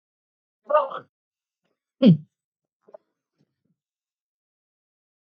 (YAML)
three_cough_length: 5.3 s
three_cough_amplitude: 19020
three_cough_signal_mean_std_ratio: 0.19
survey_phase: beta (2021-08-13 to 2022-03-07)
age: 65+
gender: Male
wearing_mask: 'No'
symptom_none: true
symptom_onset: 12 days
smoker_status: Ex-smoker
respiratory_condition_asthma: false
respiratory_condition_other: false
recruitment_source: REACT
submission_delay: 2 days
covid_test_result: Negative
covid_test_method: RT-qPCR
influenza_a_test_result: Negative
influenza_b_test_result: Negative